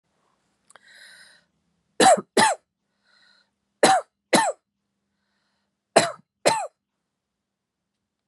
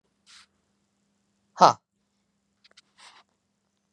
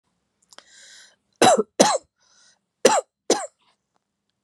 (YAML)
three_cough_length: 8.3 s
three_cough_amplitude: 27437
three_cough_signal_mean_std_ratio: 0.28
exhalation_length: 3.9 s
exhalation_amplitude: 30406
exhalation_signal_mean_std_ratio: 0.12
cough_length: 4.4 s
cough_amplitude: 32767
cough_signal_mean_std_ratio: 0.3
survey_phase: beta (2021-08-13 to 2022-03-07)
age: 45-64
gender: Female
wearing_mask: 'No'
symptom_none: true
smoker_status: Never smoked
respiratory_condition_asthma: false
respiratory_condition_other: false
recruitment_source: REACT
submission_delay: 3 days
covid_test_result: Negative
covid_test_method: RT-qPCR
influenza_a_test_result: Unknown/Void
influenza_b_test_result: Unknown/Void